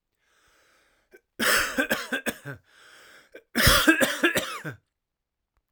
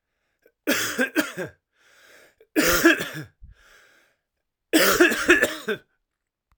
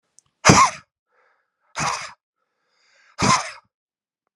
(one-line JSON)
{"cough_length": "5.7 s", "cough_amplitude": 21343, "cough_signal_mean_std_ratio": 0.42, "three_cough_length": "6.6 s", "three_cough_amplitude": 27564, "three_cough_signal_mean_std_ratio": 0.42, "exhalation_length": "4.4 s", "exhalation_amplitude": 32768, "exhalation_signal_mean_std_ratio": 0.3, "survey_phase": "alpha (2021-03-01 to 2021-08-12)", "age": "45-64", "gender": "Male", "wearing_mask": "No", "symptom_cough_any": true, "symptom_fatigue": true, "symptom_change_to_sense_of_smell_or_taste": true, "symptom_loss_of_taste": true, "symptom_onset": "3 days", "smoker_status": "Ex-smoker", "respiratory_condition_asthma": false, "respiratory_condition_other": false, "recruitment_source": "Test and Trace", "submission_delay": "2 days", "covid_test_result": "Positive", "covid_test_method": "RT-qPCR"}